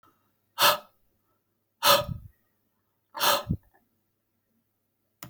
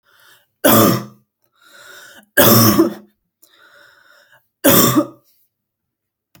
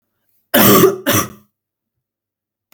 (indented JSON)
{
  "exhalation_length": "5.3 s",
  "exhalation_amplitude": 16632,
  "exhalation_signal_mean_std_ratio": 0.29,
  "three_cough_length": "6.4 s",
  "three_cough_amplitude": 32768,
  "three_cough_signal_mean_std_ratio": 0.38,
  "cough_length": "2.7 s",
  "cough_amplitude": 32768,
  "cough_signal_mean_std_ratio": 0.39,
  "survey_phase": "alpha (2021-03-01 to 2021-08-12)",
  "age": "18-44",
  "gender": "Female",
  "wearing_mask": "No",
  "symptom_cough_any": true,
  "smoker_status": "Never smoked",
  "respiratory_condition_asthma": false,
  "respiratory_condition_other": false,
  "recruitment_source": "REACT",
  "submission_delay": "1 day",
  "covid_test_result": "Negative",
  "covid_test_method": "RT-qPCR"
}